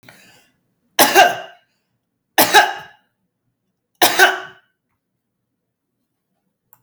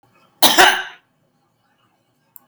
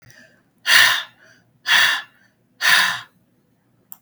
{
  "three_cough_length": "6.8 s",
  "three_cough_amplitude": 32768,
  "three_cough_signal_mean_std_ratio": 0.29,
  "cough_length": "2.5 s",
  "cough_amplitude": 32768,
  "cough_signal_mean_std_ratio": 0.3,
  "exhalation_length": "4.0 s",
  "exhalation_amplitude": 32768,
  "exhalation_signal_mean_std_ratio": 0.42,
  "survey_phase": "beta (2021-08-13 to 2022-03-07)",
  "age": "65+",
  "gender": "Female",
  "wearing_mask": "No",
  "symptom_none": true,
  "smoker_status": "Never smoked",
  "respiratory_condition_asthma": false,
  "respiratory_condition_other": true,
  "recruitment_source": "REACT",
  "submission_delay": "6 days",
  "covid_test_result": "Negative",
  "covid_test_method": "RT-qPCR",
  "influenza_a_test_result": "Negative",
  "influenza_b_test_result": "Negative"
}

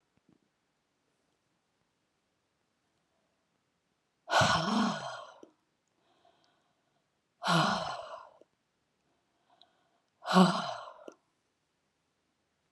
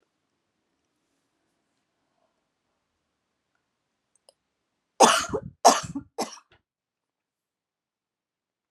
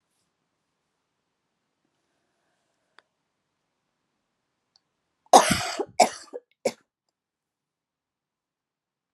{
  "exhalation_length": "12.7 s",
  "exhalation_amplitude": 9907,
  "exhalation_signal_mean_std_ratio": 0.29,
  "three_cough_length": "8.7 s",
  "three_cough_amplitude": 28153,
  "three_cough_signal_mean_std_ratio": 0.18,
  "cough_length": "9.1 s",
  "cough_amplitude": 30143,
  "cough_signal_mean_std_ratio": 0.16,
  "survey_phase": "alpha (2021-03-01 to 2021-08-12)",
  "age": "65+",
  "gender": "Female",
  "wearing_mask": "No",
  "symptom_none": true,
  "smoker_status": "Never smoked",
  "respiratory_condition_asthma": false,
  "respiratory_condition_other": false,
  "recruitment_source": "REACT",
  "submission_delay": "3 days",
  "covid_test_result": "Negative",
  "covid_test_method": "RT-qPCR"
}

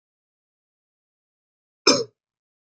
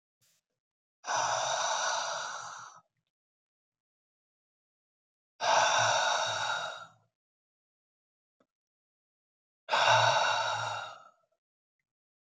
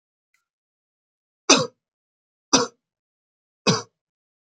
{
  "cough_length": "2.6 s",
  "cough_amplitude": 27041,
  "cough_signal_mean_std_ratio": 0.18,
  "exhalation_length": "12.2 s",
  "exhalation_amplitude": 7971,
  "exhalation_signal_mean_std_ratio": 0.46,
  "three_cough_length": "4.5 s",
  "three_cough_amplitude": 32018,
  "three_cough_signal_mean_std_ratio": 0.22,
  "survey_phase": "beta (2021-08-13 to 2022-03-07)",
  "age": "18-44",
  "gender": "Male",
  "wearing_mask": "No",
  "symptom_abdominal_pain": true,
  "symptom_diarrhoea": true,
  "symptom_onset": "2 days",
  "smoker_status": "Never smoked",
  "respiratory_condition_asthma": true,
  "respiratory_condition_other": false,
  "recruitment_source": "REACT",
  "submission_delay": "0 days",
  "covid_test_result": "Negative",
  "covid_test_method": "RT-qPCR"
}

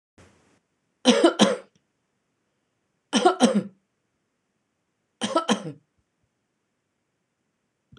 {
  "three_cough_length": "8.0 s",
  "three_cough_amplitude": 25157,
  "three_cough_signal_mean_std_ratio": 0.29,
  "survey_phase": "beta (2021-08-13 to 2022-03-07)",
  "age": "45-64",
  "gender": "Female",
  "wearing_mask": "No",
  "symptom_none": true,
  "smoker_status": "Ex-smoker",
  "respiratory_condition_asthma": false,
  "respiratory_condition_other": false,
  "recruitment_source": "REACT",
  "submission_delay": "1 day",
  "covid_test_result": "Negative",
  "covid_test_method": "RT-qPCR",
  "influenza_a_test_result": "Negative",
  "influenza_b_test_result": "Negative"
}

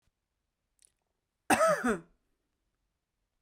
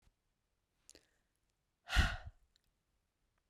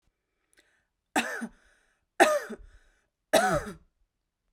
{
  "cough_length": "3.4 s",
  "cough_amplitude": 9594,
  "cough_signal_mean_std_ratio": 0.28,
  "exhalation_length": "3.5 s",
  "exhalation_amplitude": 4646,
  "exhalation_signal_mean_std_ratio": 0.21,
  "three_cough_length": "4.5 s",
  "three_cough_amplitude": 18402,
  "three_cough_signal_mean_std_ratio": 0.32,
  "survey_phase": "beta (2021-08-13 to 2022-03-07)",
  "age": "18-44",
  "gender": "Female",
  "wearing_mask": "No",
  "symptom_none": true,
  "smoker_status": "Never smoked",
  "respiratory_condition_asthma": false,
  "respiratory_condition_other": false,
  "recruitment_source": "REACT",
  "submission_delay": "1 day",
  "covid_test_result": "Negative",
  "covid_test_method": "RT-qPCR"
}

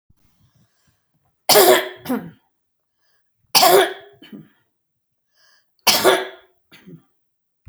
{
  "three_cough_length": "7.7 s",
  "three_cough_amplitude": 32768,
  "three_cough_signal_mean_std_ratio": 0.32,
  "survey_phase": "beta (2021-08-13 to 2022-03-07)",
  "age": "65+",
  "gender": "Female",
  "wearing_mask": "No",
  "symptom_none": true,
  "smoker_status": "Ex-smoker",
  "respiratory_condition_asthma": false,
  "respiratory_condition_other": false,
  "recruitment_source": "REACT",
  "submission_delay": "3 days",
  "covid_test_result": "Negative",
  "covid_test_method": "RT-qPCR"
}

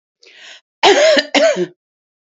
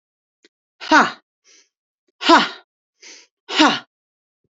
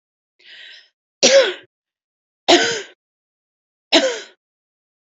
{
  "cough_length": "2.2 s",
  "cough_amplitude": 29762,
  "cough_signal_mean_std_ratio": 0.51,
  "exhalation_length": "4.5 s",
  "exhalation_amplitude": 29553,
  "exhalation_signal_mean_std_ratio": 0.3,
  "three_cough_length": "5.1 s",
  "three_cough_amplitude": 32768,
  "three_cough_signal_mean_std_ratio": 0.31,
  "survey_phase": "beta (2021-08-13 to 2022-03-07)",
  "age": "65+",
  "gender": "Female",
  "wearing_mask": "No",
  "symptom_none": true,
  "smoker_status": "Ex-smoker",
  "respiratory_condition_asthma": false,
  "respiratory_condition_other": false,
  "recruitment_source": "REACT",
  "submission_delay": "3 days",
  "covid_test_result": "Negative",
  "covid_test_method": "RT-qPCR",
  "influenza_a_test_result": "Negative",
  "influenza_b_test_result": "Negative"
}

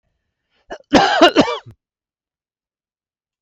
{
  "cough_length": "3.4 s",
  "cough_amplitude": 32768,
  "cough_signal_mean_std_ratio": 0.32,
  "survey_phase": "beta (2021-08-13 to 2022-03-07)",
  "age": "45-64",
  "gender": "Male",
  "wearing_mask": "No",
  "symptom_none": true,
  "symptom_onset": "2 days",
  "smoker_status": "Never smoked",
  "respiratory_condition_asthma": false,
  "respiratory_condition_other": false,
  "recruitment_source": "Test and Trace",
  "submission_delay": "1 day",
  "covid_test_result": "Negative",
  "covid_test_method": "RT-qPCR"
}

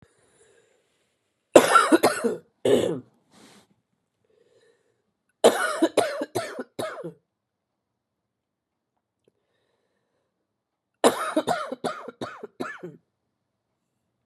{
  "three_cough_length": "14.3 s",
  "three_cough_amplitude": 32768,
  "three_cough_signal_mean_std_ratio": 0.3,
  "survey_phase": "beta (2021-08-13 to 2022-03-07)",
  "age": "45-64",
  "gender": "Female",
  "wearing_mask": "No",
  "symptom_cough_any": true,
  "symptom_new_continuous_cough": true,
  "symptom_runny_or_blocked_nose": true,
  "symptom_sore_throat": true,
  "symptom_abdominal_pain": true,
  "symptom_fatigue": true,
  "symptom_fever_high_temperature": true,
  "symptom_headache": true,
  "smoker_status": "Never smoked",
  "respiratory_condition_asthma": false,
  "respiratory_condition_other": false,
  "recruitment_source": "Test and Trace",
  "submission_delay": "2 days",
  "covid_test_result": "Positive",
  "covid_test_method": "LFT"
}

